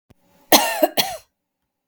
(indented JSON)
{
  "cough_length": "1.9 s",
  "cough_amplitude": 32768,
  "cough_signal_mean_std_ratio": 0.35,
  "survey_phase": "beta (2021-08-13 to 2022-03-07)",
  "age": "45-64",
  "gender": "Female",
  "wearing_mask": "No",
  "symptom_none": true,
  "smoker_status": "Ex-smoker",
  "respiratory_condition_asthma": false,
  "respiratory_condition_other": false,
  "recruitment_source": "REACT",
  "submission_delay": "1 day",
  "covid_test_result": "Negative",
  "covid_test_method": "RT-qPCR",
  "influenza_a_test_result": "Negative",
  "influenza_b_test_result": "Negative"
}